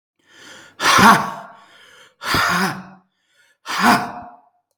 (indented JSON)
{
  "exhalation_length": "4.8 s",
  "exhalation_amplitude": 32766,
  "exhalation_signal_mean_std_ratio": 0.44,
  "survey_phase": "beta (2021-08-13 to 2022-03-07)",
  "age": "45-64",
  "gender": "Male",
  "wearing_mask": "No",
  "symptom_cough_any": true,
  "symptom_new_continuous_cough": true,
  "symptom_runny_or_blocked_nose": true,
  "symptom_other": true,
  "symptom_onset": "3 days",
  "smoker_status": "Never smoked",
  "respiratory_condition_asthma": true,
  "respiratory_condition_other": false,
  "recruitment_source": "REACT",
  "submission_delay": "1 day",
  "covid_test_result": "Negative",
  "covid_test_method": "RT-qPCR",
  "influenza_a_test_result": "Negative",
  "influenza_b_test_result": "Negative"
}